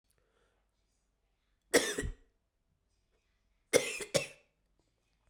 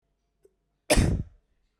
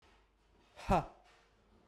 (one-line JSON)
{"three_cough_length": "5.3 s", "three_cough_amplitude": 9273, "three_cough_signal_mean_std_ratio": 0.24, "cough_length": "1.8 s", "cough_amplitude": 13780, "cough_signal_mean_std_ratio": 0.33, "exhalation_length": "1.9 s", "exhalation_amplitude": 4050, "exhalation_signal_mean_std_ratio": 0.27, "survey_phase": "beta (2021-08-13 to 2022-03-07)", "age": "18-44", "gender": "Male", "wearing_mask": "No", "symptom_cough_any": true, "symptom_sore_throat": true, "symptom_headache": true, "symptom_onset": "4 days", "smoker_status": "Never smoked", "respiratory_condition_asthma": true, "respiratory_condition_other": false, "recruitment_source": "Test and Trace", "submission_delay": "1 day", "covid_test_result": "Positive", "covid_test_method": "RT-qPCR", "covid_ct_value": 30.4, "covid_ct_gene": "N gene"}